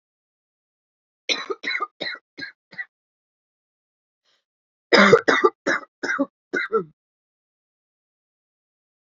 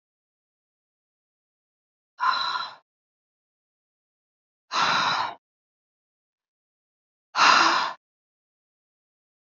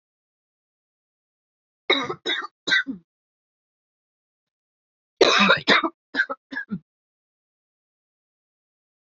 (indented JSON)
{
  "cough_length": "9.0 s",
  "cough_amplitude": 28740,
  "cough_signal_mean_std_ratio": 0.28,
  "exhalation_length": "9.5 s",
  "exhalation_amplitude": 20406,
  "exhalation_signal_mean_std_ratio": 0.31,
  "three_cough_length": "9.1 s",
  "three_cough_amplitude": 26467,
  "three_cough_signal_mean_std_ratio": 0.29,
  "survey_phase": "alpha (2021-03-01 to 2021-08-12)",
  "age": "45-64",
  "gender": "Female",
  "wearing_mask": "No",
  "symptom_cough_any": true,
  "symptom_fatigue": true,
  "symptom_fever_high_temperature": true,
  "symptom_headache": true,
  "symptom_change_to_sense_of_smell_or_taste": true,
  "symptom_onset": "6 days",
  "smoker_status": "Never smoked",
  "respiratory_condition_asthma": false,
  "respiratory_condition_other": false,
  "recruitment_source": "Test and Trace",
  "submission_delay": "2 days",
  "covid_test_result": "Positive",
  "covid_test_method": "RT-qPCR",
  "covid_ct_value": 19.2,
  "covid_ct_gene": "ORF1ab gene"
}